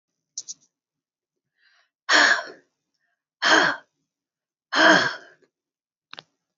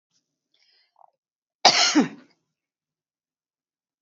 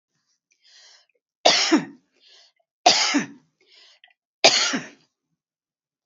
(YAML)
exhalation_length: 6.6 s
exhalation_amplitude: 23253
exhalation_signal_mean_std_ratio: 0.32
cough_length: 4.0 s
cough_amplitude: 30179
cough_signal_mean_std_ratio: 0.24
three_cough_length: 6.1 s
three_cough_amplitude: 32767
three_cough_signal_mean_std_ratio: 0.32
survey_phase: beta (2021-08-13 to 2022-03-07)
age: 45-64
gender: Female
wearing_mask: 'No'
symptom_none: true
smoker_status: Ex-smoker
respiratory_condition_asthma: false
respiratory_condition_other: false
recruitment_source: REACT
submission_delay: 1 day
covid_test_result: Negative
covid_test_method: RT-qPCR
influenza_a_test_result: Unknown/Void
influenza_b_test_result: Unknown/Void